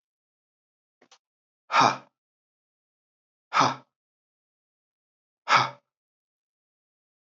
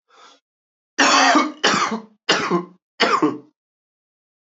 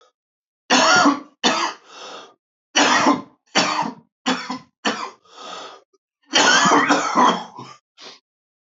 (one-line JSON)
{"exhalation_length": "7.3 s", "exhalation_amplitude": 17481, "exhalation_signal_mean_std_ratio": 0.22, "cough_length": "4.5 s", "cough_amplitude": 28644, "cough_signal_mean_std_ratio": 0.48, "three_cough_length": "8.7 s", "three_cough_amplitude": 26739, "three_cough_signal_mean_std_ratio": 0.5, "survey_phase": "beta (2021-08-13 to 2022-03-07)", "age": "45-64", "gender": "Male", "wearing_mask": "No", "symptom_cough_any": true, "symptom_new_continuous_cough": true, "symptom_shortness_of_breath": true, "symptom_sore_throat": true, "symptom_fatigue": true, "symptom_headache": true, "symptom_change_to_sense_of_smell_or_taste": true, "smoker_status": "Ex-smoker", "respiratory_condition_asthma": false, "respiratory_condition_other": false, "recruitment_source": "Test and Trace", "submission_delay": "3 days", "covid_test_result": "Positive", "covid_test_method": "LFT"}